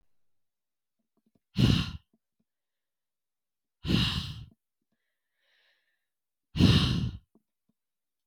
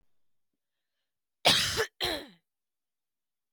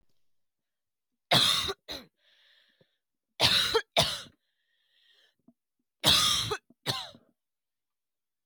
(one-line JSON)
{"exhalation_length": "8.3 s", "exhalation_amplitude": 12015, "exhalation_signal_mean_std_ratio": 0.3, "cough_length": "3.5 s", "cough_amplitude": 14374, "cough_signal_mean_std_ratio": 0.3, "three_cough_length": "8.5 s", "three_cough_amplitude": 17048, "three_cough_signal_mean_std_ratio": 0.35, "survey_phase": "beta (2021-08-13 to 2022-03-07)", "age": "18-44", "gender": "Female", "wearing_mask": "No", "symptom_cough_any": true, "symptom_runny_or_blocked_nose": true, "symptom_headache": true, "symptom_other": true, "symptom_onset": "6 days", "smoker_status": "Never smoked", "respiratory_condition_asthma": false, "respiratory_condition_other": false, "recruitment_source": "Test and Trace", "submission_delay": "2 days", "covid_test_result": "Positive", "covid_test_method": "RT-qPCR", "covid_ct_value": 24.5, "covid_ct_gene": "ORF1ab gene", "covid_ct_mean": 24.8, "covid_viral_load": "7200 copies/ml", "covid_viral_load_category": "Minimal viral load (< 10K copies/ml)"}